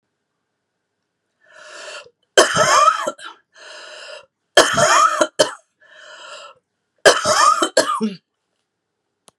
{"three_cough_length": "9.4 s", "three_cough_amplitude": 32768, "three_cough_signal_mean_std_ratio": 0.41, "survey_phase": "beta (2021-08-13 to 2022-03-07)", "age": "45-64", "gender": "Female", "wearing_mask": "No", "symptom_none": true, "smoker_status": "Ex-smoker", "respiratory_condition_asthma": false, "respiratory_condition_other": false, "recruitment_source": "REACT", "submission_delay": "1 day", "covid_test_result": "Negative", "covid_test_method": "RT-qPCR", "influenza_a_test_result": "Negative", "influenza_b_test_result": "Negative"}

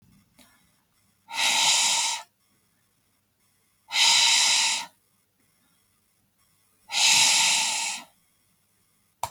{"exhalation_length": "9.3 s", "exhalation_amplitude": 15942, "exhalation_signal_mean_std_ratio": 0.47, "survey_phase": "beta (2021-08-13 to 2022-03-07)", "age": "45-64", "gender": "Female", "wearing_mask": "No", "symptom_none": true, "smoker_status": "Never smoked", "respiratory_condition_asthma": false, "respiratory_condition_other": false, "recruitment_source": "Test and Trace", "submission_delay": "2 days", "covid_test_result": "Negative", "covid_test_method": "LFT"}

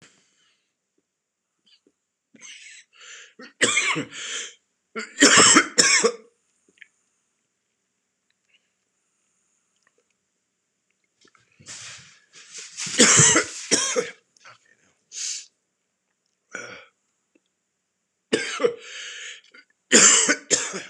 {"three_cough_length": "20.9 s", "three_cough_amplitude": 26028, "three_cough_signal_mean_std_ratio": 0.32, "survey_phase": "beta (2021-08-13 to 2022-03-07)", "age": "45-64", "gender": "Male", "wearing_mask": "No", "symptom_cough_any": true, "symptom_new_continuous_cough": true, "symptom_fatigue": true, "symptom_change_to_sense_of_smell_or_taste": true, "symptom_onset": "5 days", "smoker_status": "Ex-smoker", "respiratory_condition_asthma": false, "respiratory_condition_other": false, "recruitment_source": "Test and Trace", "submission_delay": "1 day", "covid_test_result": "Positive", "covid_test_method": "RT-qPCR", "covid_ct_value": 15.3, "covid_ct_gene": "ORF1ab gene", "covid_ct_mean": 15.5, "covid_viral_load": "8200000 copies/ml", "covid_viral_load_category": "High viral load (>1M copies/ml)"}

